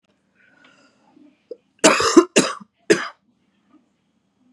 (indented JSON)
{
  "cough_length": "4.5 s",
  "cough_amplitude": 32767,
  "cough_signal_mean_std_ratio": 0.27,
  "survey_phase": "beta (2021-08-13 to 2022-03-07)",
  "age": "18-44",
  "gender": "Female",
  "wearing_mask": "No",
  "symptom_cough_any": true,
  "symptom_runny_or_blocked_nose": true,
  "symptom_sore_throat": true,
  "symptom_fatigue": true,
  "symptom_fever_high_temperature": true,
  "symptom_other": true,
  "symptom_onset": "2 days",
  "smoker_status": "Current smoker (11 or more cigarettes per day)",
  "respiratory_condition_asthma": false,
  "respiratory_condition_other": false,
  "recruitment_source": "Test and Trace",
  "submission_delay": "1 day",
  "covid_test_result": "Positive",
  "covid_test_method": "RT-qPCR",
  "covid_ct_value": 18.8,
  "covid_ct_gene": "ORF1ab gene",
  "covid_ct_mean": 19.2,
  "covid_viral_load": "490000 copies/ml",
  "covid_viral_load_category": "Low viral load (10K-1M copies/ml)"
}